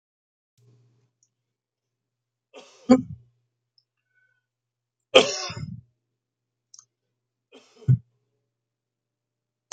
{
  "three_cough_length": "9.7 s",
  "three_cough_amplitude": 31927,
  "three_cough_signal_mean_std_ratio": 0.17,
  "survey_phase": "beta (2021-08-13 to 2022-03-07)",
  "age": "65+",
  "gender": "Male",
  "wearing_mask": "No",
  "symptom_none": true,
  "smoker_status": "Never smoked",
  "respiratory_condition_asthma": false,
  "respiratory_condition_other": false,
  "recruitment_source": "REACT",
  "submission_delay": "2 days",
  "covid_test_result": "Negative",
  "covid_test_method": "RT-qPCR"
}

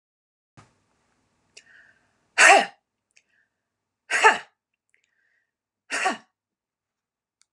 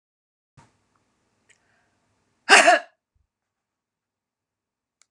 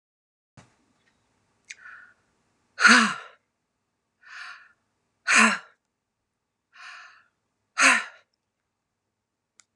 {
  "three_cough_length": "7.5 s",
  "three_cough_amplitude": 28473,
  "three_cough_signal_mean_std_ratio": 0.22,
  "cough_length": "5.1 s",
  "cough_amplitude": 32765,
  "cough_signal_mean_std_ratio": 0.19,
  "exhalation_length": "9.8 s",
  "exhalation_amplitude": 25292,
  "exhalation_signal_mean_std_ratio": 0.24,
  "survey_phase": "beta (2021-08-13 to 2022-03-07)",
  "age": "45-64",
  "gender": "Female",
  "wearing_mask": "No",
  "symptom_none": true,
  "smoker_status": "Never smoked",
  "respiratory_condition_asthma": false,
  "respiratory_condition_other": false,
  "recruitment_source": "REACT",
  "submission_delay": "2 days",
  "covid_test_result": "Negative",
  "covid_test_method": "RT-qPCR"
}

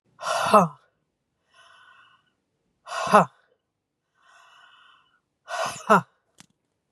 {
  "exhalation_length": "6.9 s",
  "exhalation_amplitude": 28465,
  "exhalation_signal_mean_std_ratio": 0.27,
  "survey_phase": "beta (2021-08-13 to 2022-03-07)",
  "age": "45-64",
  "gender": "Female",
  "wearing_mask": "No",
  "symptom_runny_or_blocked_nose": true,
  "symptom_shortness_of_breath": true,
  "smoker_status": "Never smoked",
  "respiratory_condition_asthma": true,
  "respiratory_condition_other": false,
  "recruitment_source": "REACT",
  "submission_delay": "2 days",
  "covid_test_result": "Negative",
  "covid_test_method": "RT-qPCR",
  "influenza_a_test_result": "Unknown/Void",
  "influenza_b_test_result": "Unknown/Void"
}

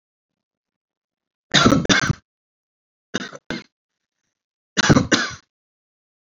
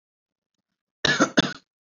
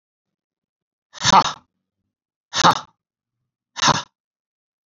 {
  "three_cough_length": "6.2 s",
  "three_cough_amplitude": 28945,
  "three_cough_signal_mean_std_ratio": 0.31,
  "cough_length": "1.9 s",
  "cough_amplitude": 23409,
  "cough_signal_mean_std_ratio": 0.31,
  "exhalation_length": "4.9 s",
  "exhalation_amplitude": 32768,
  "exhalation_signal_mean_std_ratio": 0.26,
  "survey_phase": "beta (2021-08-13 to 2022-03-07)",
  "age": "18-44",
  "gender": "Male",
  "wearing_mask": "No",
  "symptom_sore_throat": true,
  "smoker_status": "Never smoked",
  "respiratory_condition_asthma": false,
  "respiratory_condition_other": false,
  "recruitment_source": "Test and Trace",
  "submission_delay": "2 days",
  "covid_test_result": "Positive",
  "covid_test_method": "RT-qPCR",
  "covid_ct_value": 24.9,
  "covid_ct_gene": "N gene"
}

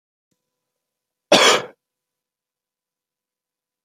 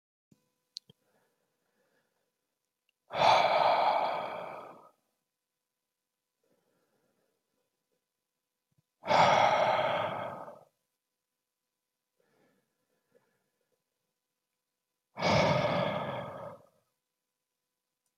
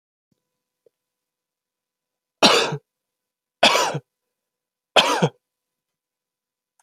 {
  "cough_length": "3.8 s",
  "cough_amplitude": 29571,
  "cough_signal_mean_std_ratio": 0.22,
  "exhalation_length": "18.2 s",
  "exhalation_amplitude": 8323,
  "exhalation_signal_mean_std_ratio": 0.35,
  "three_cough_length": "6.8 s",
  "three_cough_amplitude": 31817,
  "three_cough_signal_mean_std_ratio": 0.27,
  "survey_phase": "beta (2021-08-13 to 2022-03-07)",
  "age": "18-44",
  "gender": "Male",
  "wearing_mask": "No",
  "symptom_cough_any": true,
  "symptom_new_continuous_cough": true,
  "symptom_runny_or_blocked_nose": true,
  "symptom_sore_throat": true,
  "symptom_fatigue": true,
  "symptom_fever_high_temperature": true,
  "symptom_onset": "3 days",
  "smoker_status": "Ex-smoker",
  "respiratory_condition_asthma": false,
  "respiratory_condition_other": false,
  "recruitment_source": "Test and Trace",
  "submission_delay": "2 days",
  "covid_test_result": "Positive",
  "covid_test_method": "ePCR"
}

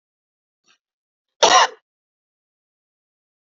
{
  "cough_length": "3.5 s",
  "cough_amplitude": 30809,
  "cough_signal_mean_std_ratio": 0.21,
  "survey_phase": "beta (2021-08-13 to 2022-03-07)",
  "age": "18-44",
  "gender": "Female",
  "wearing_mask": "No",
  "symptom_runny_or_blocked_nose": true,
  "smoker_status": "Never smoked",
  "respiratory_condition_asthma": false,
  "respiratory_condition_other": false,
  "recruitment_source": "Test and Trace",
  "submission_delay": "1 day",
  "covid_test_method": "RT-qPCR"
}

